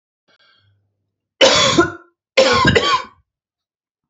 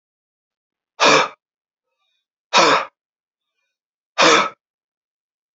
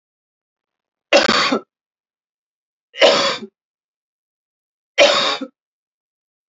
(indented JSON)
{
  "cough_length": "4.1 s",
  "cough_amplitude": 32768,
  "cough_signal_mean_std_ratio": 0.43,
  "exhalation_length": "5.5 s",
  "exhalation_amplitude": 30615,
  "exhalation_signal_mean_std_ratio": 0.31,
  "three_cough_length": "6.5 s",
  "three_cough_amplitude": 32768,
  "three_cough_signal_mean_std_ratio": 0.33,
  "survey_phase": "alpha (2021-03-01 to 2021-08-12)",
  "age": "18-44",
  "gender": "Male",
  "wearing_mask": "No",
  "symptom_cough_any": true,
  "symptom_new_continuous_cough": true,
  "symptom_diarrhoea": true,
  "symptom_fatigue": true,
  "symptom_fever_high_temperature": true,
  "symptom_headache": true,
  "symptom_onset": "2 days",
  "smoker_status": "Never smoked",
  "respiratory_condition_asthma": false,
  "respiratory_condition_other": false,
  "recruitment_source": "Test and Trace",
  "submission_delay": "2 days",
  "covid_test_result": "Positive",
  "covid_test_method": "RT-qPCR",
  "covid_ct_value": 27.6,
  "covid_ct_gene": "ORF1ab gene"
}